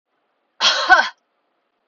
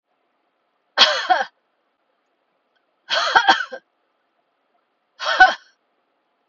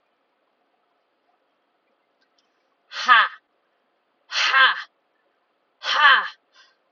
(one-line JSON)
{"cough_length": "1.9 s", "cough_amplitude": 29933, "cough_signal_mean_std_ratio": 0.36, "three_cough_length": "6.5 s", "three_cough_amplitude": 32680, "three_cough_signal_mean_std_ratio": 0.3, "exhalation_length": "6.9 s", "exhalation_amplitude": 28985, "exhalation_signal_mean_std_ratio": 0.3, "survey_phase": "beta (2021-08-13 to 2022-03-07)", "age": "45-64", "gender": "Female", "wearing_mask": "No", "symptom_headache": true, "smoker_status": "Never smoked", "respiratory_condition_asthma": false, "respiratory_condition_other": false, "recruitment_source": "REACT", "submission_delay": "1 day", "covid_test_result": "Negative", "covid_test_method": "RT-qPCR"}